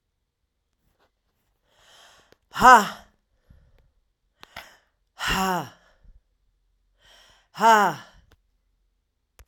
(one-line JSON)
{"exhalation_length": "9.5 s", "exhalation_amplitude": 32767, "exhalation_signal_mean_std_ratio": 0.23, "survey_phase": "alpha (2021-03-01 to 2021-08-12)", "age": "45-64", "gender": "Female", "wearing_mask": "No", "symptom_cough_any": true, "symptom_diarrhoea": true, "symptom_change_to_sense_of_smell_or_taste": true, "symptom_loss_of_taste": true, "smoker_status": "Ex-smoker", "respiratory_condition_asthma": false, "respiratory_condition_other": false, "recruitment_source": "Test and Trace", "submission_delay": "2 days", "covid_test_result": "Positive", "covid_test_method": "RT-qPCR", "covid_ct_value": 18.4, "covid_ct_gene": "ORF1ab gene", "covid_ct_mean": 22.3, "covid_viral_load": "50000 copies/ml", "covid_viral_load_category": "Low viral load (10K-1M copies/ml)"}